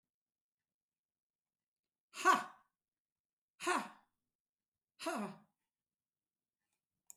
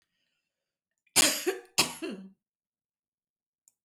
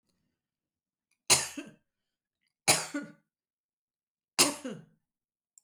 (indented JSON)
{
  "exhalation_length": "7.2 s",
  "exhalation_amplitude": 4809,
  "exhalation_signal_mean_std_ratio": 0.22,
  "cough_length": "3.8 s",
  "cough_amplitude": 12923,
  "cough_signal_mean_std_ratio": 0.28,
  "three_cough_length": "5.6 s",
  "three_cough_amplitude": 13013,
  "three_cough_signal_mean_std_ratio": 0.24,
  "survey_phase": "beta (2021-08-13 to 2022-03-07)",
  "age": "65+",
  "gender": "Female",
  "wearing_mask": "No",
  "symptom_none": true,
  "smoker_status": "Never smoked",
  "respiratory_condition_asthma": false,
  "respiratory_condition_other": false,
  "recruitment_source": "REACT",
  "submission_delay": "2 days",
  "covid_test_result": "Negative",
  "covid_test_method": "RT-qPCR",
  "influenza_a_test_result": "Negative",
  "influenza_b_test_result": "Negative"
}